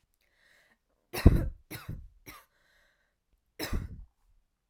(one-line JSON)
{"three_cough_length": "4.7 s", "three_cough_amplitude": 19202, "three_cough_signal_mean_std_ratio": 0.23, "survey_phase": "alpha (2021-03-01 to 2021-08-12)", "age": "18-44", "gender": "Female", "wearing_mask": "No", "symptom_none": true, "symptom_onset": "13 days", "smoker_status": "Never smoked", "respiratory_condition_asthma": false, "respiratory_condition_other": false, "recruitment_source": "REACT", "submission_delay": "2 days", "covid_test_result": "Negative", "covid_test_method": "RT-qPCR"}